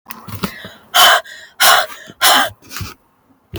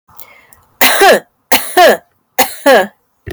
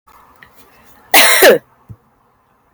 exhalation_length: 3.6 s
exhalation_amplitude: 32768
exhalation_signal_mean_std_ratio: 0.46
three_cough_length: 3.3 s
three_cough_amplitude: 32768
three_cough_signal_mean_std_ratio: 0.52
cough_length: 2.7 s
cough_amplitude: 32768
cough_signal_mean_std_ratio: 0.37
survey_phase: beta (2021-08-13 to 2022-03-07)
age: 18-44
gender: Female
wearing_mask: 'No'
symptom_diarrhoea: true
symptom_fatigue: true
symptom_headache: true
symptom_loss_of_taste: true
symptom_onset: 3 days
smoker_status: Never smoked
respiratory_condition_asthma: false
respiratory_condition_other: false
recruitment_source: Test and Trace
submission_delay: 2 days
covid_test_result: Positive
covid_test_method: RT-qPCR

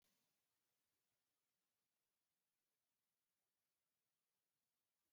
cough_length: 5.1 s
cough_amplitude: 12
cough_signal_mean_std_ratio: 0.6
survey_phase: beta (2021-08-13 to 2022-03-07)
age: 45-64
gender: Male
wearing_mask: 'No'
symptom_none: true
smoker_status: Never smoked
respiratory_condition_asthma: false
respiratory_condition_other: false
recruitment_source: REACT
submission_delay: 1 day
covid_test_result: Negative
covid_test_method: RT-qPCR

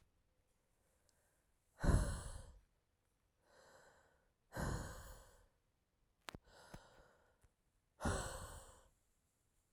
exhalation_length: 9.7 s
exhalation_amplitude: 2803
exhalation_signal_mean_std_ratio: 0.3
survey_phase: alpha (2021-03-01 to 2021-08-12)
age: 45-64
gender: Female
wearing_mask: 'No'
symptom_fatigue: true
symptom_change_to_sense_of_smell_or_taste: true
symptom_loss_of_taste: true
symptom_onset: 2 days
smoker_status: Ex-smoker
respiratory_condition_asthma: false
respiratory_condition_other: false
recruitment_source: Test and Trace
submission_delay: 2 days
covid_test_result: Positive
covid_test_method: RT-qPCR
covid_ct_value: 15.1
covid_ct_gene: ORF1ab gene
covid_ct_mean: 15.6
covid_viral_load: 7400000 copies/ml
covid_viral_load_category: High viral load (>1M copies/ml)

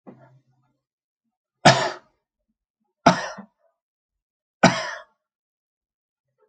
three_cough_length: 6.5 s
three_cough_amplitude: 32768
three_cough_signal_mean_std_ratio: 0.22
survey_phase: alpha (2021-03-01 to 2021-08-12)
age: 65+
gender: Male
wearing_mask: 'No'
symptom_cough_any: true
smoker_status: Ex-smoker
respiratory_condition_asthma: false
respiratory_condition_other: false
recruitment_source: REACT
submission_delay: 3 days
covid_test_result: Negative
covid_test_method: RT-qPCR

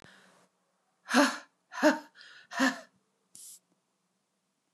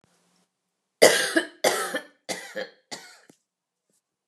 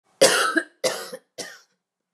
exhalation_length: 4.7 s
exhalation_amplitude: 12281
exhalation_signal_mean_std_ratio: 0.29
three_cough_length: 4.3 s
three_cough_amplitude: 29164
three_cough_signal_mean_std_ratio: 0.31
cough_length: 2.1 s
cough_amplitude: 24432
cough_signal_mean_std_ratio: 0.41
survey_phase: beta (2021-08-13 to 2022-03-07)
age: 45-64
gender: Female
wearing_mask: 'No'
symptom_none: true
smoker_status: Never smoked
respiratory_condition_asthma: false
respiratory_condition_other: false
recruitment_source: REACT
submission_delay: 2 days
covid_test_result: Negative
covid_test_method: RT-qPCR
influenza_a_test_result: Negative
influenza_b_test_result: Negative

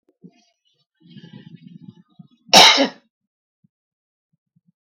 cough_length: 4.9 s
cough_amplitude: 32768
cough_signal_mean_std_ratio: 0.22
survey_phase: beta (2021-08-13 to 2022-03-07)
age: 45-64
gender: Female
wearing_mask: 'No'
symptom_none: true
smoker_status: Never smoked
respiratory_condition_asthma: false
respiratory_condition_other: false
recruitment_source: REACT
submission_delay: 2 days
covid_test_result: Negative
covid_test_method: RT-qPCR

